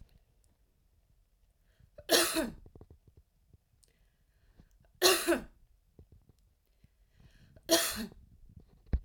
{
  "three_cough_length": "9.0 s",
  "three_cough_amplitude": 11234,
  "three_cough_signal_mean_std_ratio": 0.29,
  "survey_phase": "alpha (2021-03-01 to 2021-08-12)",
  "age": "45-64",
  "gender": "Female",
  "wearing_mask": "No",
  "symptom_none": true,
  "smoker_status": "Never smoked",
  "respiratory_condition_asthma": false,
  "respiratory_condition_other": false,
  "recruitment_source": "REACT",
  "submission_delay": "2 days",
  "covid_test_result": "Negative",
  "covid_test_method": "RT-qPCR"
}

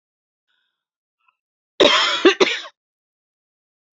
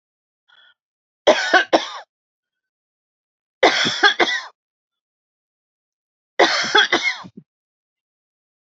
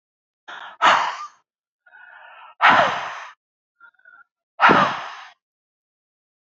{
  "cough_length": "3.9 s",
  "cough_amplitude": 30207,
  "cough_signal_mean_std_ratio": 0.3,
  "three_cough_length": "8.6 s",
  "three_cough_amplitude": 30454,
  "three_cough_signal_mean_std_ratio": 0.34,
  "exhalation_length": "6.6 s",
  "exhalation_amplitude": 32229,
  "exhalation_signal_mean_std_ratio": 0.35,
  "survey_phase": "beta (2021-08-13 to 2022-03-07)",
  "age": "45-64",
  "gender": "Female",
  "wearing_mask": "No",
  "symptom_none": true,
  "smoker_status": "Never smoked",
  "respiratory_condition_asthma": false,
  "respiratory_condition_other": false,
  "recruitment_source": "REACT",
  "submission_delay": "2 days",
  "covid_test_result": "Negative",
  "covid_test_method": "RT-qPCR",
  "influenza_a_test_result": "Negative",
  "influenza_b_test_result": "Negative"
}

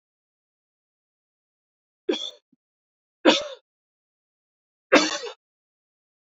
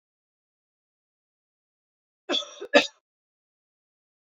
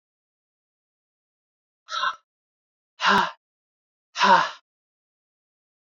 {
  "three_cough_length": "6.3 s",
  "three_cough_amplitude": 26323,
  "three_cough_signal_mean_std_ratio": 0.21,
  "cough_length": "4.3 s",
  "cough_amplitude": 22303,
  "cough_signal_mean_std_ratio": 0.17,
  "exhalation_length": "6.0 s",
  "exhalation_amplitude": 19762,
  "exhalation_signal_mean_std_ratio": 0.27,
  "survey_phase": "beta (2021-08-13 to 2022-03-07)",
  "age": "18-44",
  "gender": "Female",
  "wearing_mask": "No",
  "symptom_cough_any": true,
  "symptom_new_continuous_cough": true,
  "symptom_runny_or_blocked_nose": true,
  "symptom_shortness_of_breath": true,
  "symptom_fatigue": true,
  "symptom_onset": "5 days",
  "smoker_status": "Never smoked",
  "respiratory_condition_asthma": false,
  "respiratory_condition_other": false,
  "recruitment_source": "Test and Trace",
  "submission_delay": "2 days",
  "covid_test_result": "Positive",
  "covid_test_method": "RT-qPCR",
  "covid_ct_value": 13.8,
  "covid_ct_gene": "ORF1ab gene"
}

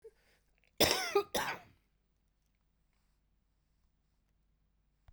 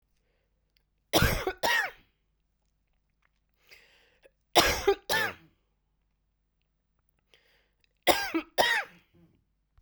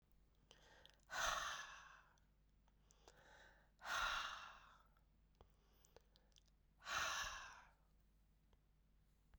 {
  "cough_length": "5.1 s",
  "cough_amplitude": 7521,
  "cough_signal_mean_std_ratio": 0.26,
  "three_cough_length": "9.8 s",
  "three_cough_amplitude": 20269,
  "three_cough_signal_mean_std_ratio": 0.32,
  "exhalation_length": "9.4 s",
  "exhalation_amplitude": 1220,
  "exhalation_signal_mean_std_ratio": 0.43,
  "survey_phase": "beta (2021-08-13 to 2022-03-07)",
  "age": "45-64",
  "gender": "Female",
  "wearing_mask": "No",
  "symptom_runny_or_blocked_nose": true,
  "symptom_shortness_of_breath": true,
  "symptom_sore_throat": true,
  "symptom_abdominal_pain": true,
  "symptom_fatigue": true,
  "symptom_headache": true,
  "symptom_onset": "4 days",
  "smoker_status": "Never smoked",
  "respiratory_condition_asthma": false,
  "respiratory_condition_other": true,
  "recruitment_source": "Test and Trace",
  "submission_delay": "3 days",
  "covid_test_method": "RT-qPCR"
}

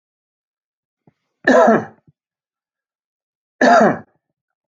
{
  "cough_length": "4.8 s",
  "cough_amplitude": 31151,
  "cough_signal_mean_std_ratio": 0.31,
  "survey_phase": "alpha (2021-03-01 to 2021-08-12)",
  "age": "65+",
  "gender": "Male",
  "wearing_mask": "No",
  "symptom_none": true,
  "smoker_status": "Ex-smoker",
  "respiratory_condition_asthma": false,
  "respiratory_condition_other": false,
  "recruitment_source": "REACT",
  "submission_delay": "1 day",
  "covid_test_result": "Negative",
  "covid_test_method": "RT-qPCR"
}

